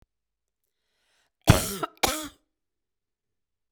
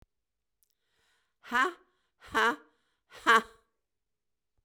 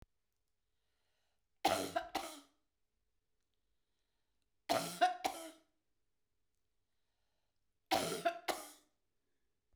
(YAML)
cough_length: 3.7 s
cough_amplitude: 27781
cough_signal_mean_std_ratio: 0.22
exhalation_length: 4.6 s
exhalation_amplitude: 10014
exhalation_signal_mean_std_ratio: 0.27
three_cough_length: 9.8 s
three_cough_amplitude: 3520
three_cough_signal_mean_std_ratio: 0.3
survey_phase: beta (2021-08-13 to 2022-03-07)
age: 65+
gender: Female
wearing_mask: 'No'
symptom_shortness_of_breath: true
smoker_status: Never smoked
respiratory_condition_asthma: true
respiratory_condition_other: false
recruitment_source: REACT
submission_delay: 2 days
covid_test_result: Negative
covid_test_method: RT-qPCR
influenza_a_test_result: Negative
influenza_b_test_result: Negative